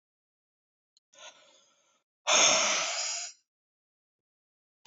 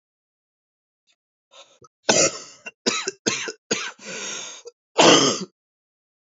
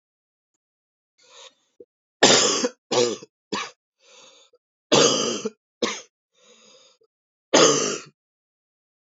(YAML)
exhalation_length: 4.9 s
exhalation_amplitude: 10258
exhalation_signal_mean_std_ratio: 0.34
cough_length: 6.3 s
cough_amplitude: 29521
cough_signal_mean_std_ratio: 0.35
three_cough_length: 9.1 s
three_cough_amplitude: 30475
three_cough_signal_mean_std_ratio: 0.34
survey_phase: beta (2021-08-13 to 2022-03-07)
age: 18-44
gender: Male
wearing_mask: 'No'
symptom_cough_any: true
symptom_onset: 10 days
smoker_status: Ex-smoker
respiratory_condition_asthma: false
respiratory_condition_other: false
recruitment_source: REACT
submission_delay: 1 day
covid_test_result: Positive
covid_test_method: RT-qPCR
covid_ct_value: 35.4
covid_ct_gene: E gene
influenza_a_test_result: Negative
influenza_b_test_result: Negative